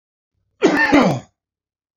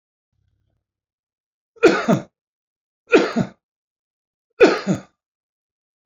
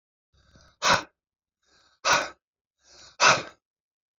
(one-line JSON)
{"cough_length": "2.0 s", "cough_amplitude": 27241, "cough_signal_mean_std_ratio": 0.44, "three_cough_length": "6.1 s", "three_cough_amplitude": 32421, "three_cough_signal_mean_std_ratio": 0.28, "exhalation_length": "4.2 s", "exhalation_amplitude": 21466, "exhalation_signal_mean_std_ratio": 0.29, "survey_phase": "beta (2021-08-13 to 2022-03-07)", "age": "45-64", "gender": "Male", "wearing_mask": "No", "symptom_shortness_of_breath": true, "symptom_change_to_sense_of_smell_or_taste": true, "symptom_onset": "8 days", "smoker_status": "Ex-smoker", "respiratory_condition_asthma": false, "respiratory_condition_other": false, "recruitment_source": "Test and Trace", "submission_delay": "2 days", "covid_test_result": "Positive", "covid_test_method": "RT-qPCR", "covid_ct_value": 28.1, "covid_ct_gene": "ORF1ab gene"}